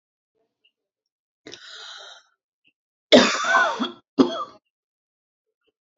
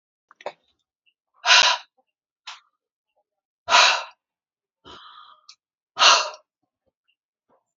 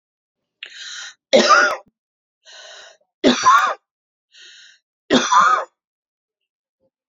{"cough_length": "6.0 s", "cough_amplitude": 28164, "cough_signal_mean_std_ratio": 0.29, "exhalation_length": "7.8 s", "exhalation_amplitude": 29122, "exhalation_signal_mean_std_ratio": 0.27, "three_cough_length": "7.1 s", "three_cough_amplitude": 28482, "three_cough_signal_mean_std_ratio": 0.37, "survey_phase": "beta (2021-08-13 to 2022-03-07)", "age": "45-64", "gender": "Female", "wearing_mask": "No", "symptom_none": true, "smoker_status": "Never smoked", "respiratory_condition_asthma": false, "respiratory_condition_other": false, "recruitment_source": "REACT", "submission_delay": "3 days", "covid_test_result": "Negative", "covid_test_method": "RT-qPCR"}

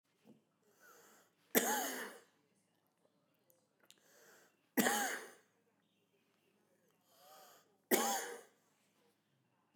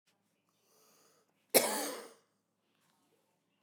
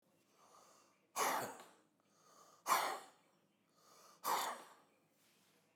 {"three_cough_length": "9.8 s", "three_cough_amplitude": 6161, "three_cough_signal_mean_std_ratio": 0.3, "cough_length": "3.6 s", "cough_amplitude": 12091, "cough_signal_mean_std_ratio": 0.23, "exhalation_length": "5.8 s", "exhalation_amplitude": 2766, "exhalation_signal_mean_std_ratio": 0.37, "survey_phase": "beta (2021-08-13 to 2022-03-07)", "age": "45-64", "gender": "Male", "wearing_mask": "No", "symptom_cough_any": true, "symptom_shortness_of_breath": true, "symptom_diarrhoea": true, "symptom_fatigue": true, "smoker_status": "Ex-smoker", "respiratory_condition_asthma": true, "respiratory_condition_other": false, "recruitment_source": "REACT", "submission_delay": "1 day", "covid_test_result": "Negative", "covid_test_method": "RT-qPCR"}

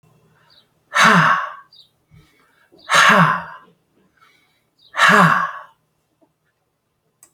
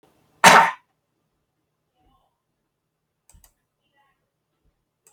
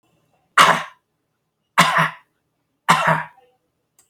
{"exhalation_length": "7.3 s", "exhalation_amplitude": 32767, "exhalation_signal_mean_std_ratio": 0.38, "cough_length": "5.1 s", "cough_amplitude": 32768, "cough_signal_mean_std_ratio": 0.18, "three_cough_length": "4.1 s", "three_cough_amplitude": 32748, "three_cough_signal_mean_std_ratio": 0.35, "survey_phase": "alpha (2021-03-01 to 2021-08-12)", "age": "45-64", "gender": "Male", "wearing_mask": "No", "symptom_none": true, "symptom_onset": "6 days", "smoker_status": "Ex-smoker", "respiratory_condition_asthma": false, "respiratory_condition_other": false, "recruitment_source": "REACT", "submission_delay": "6 days", "covid_test_result": "Negative", "covid_test_method": "RT-qPCR"}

